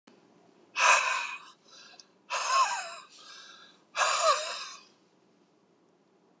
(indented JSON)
{
  "exhalation_length": "6.4 s",
  "exhalation_amplitude": 11564,
  "exhalation_signal_mean_std_ratio": 0.43,
  "survey_phase": "beta (2021-08-13 to 2022-03-07)",
  "age": "65+",
  "gender": "Male",
  "wearing_mask": "No",
  "symptom_none": true,
  "smoker_status": "Never smoked",
  "respiratory_condition_asthma": false,
  "respiratory_condition_other": false,
  "recruitment_source": "REACT",
  "submission_delay": "6 days",
  "covid_test_result": "Negative",
  "covid_test_method": "RT-qPCR"
}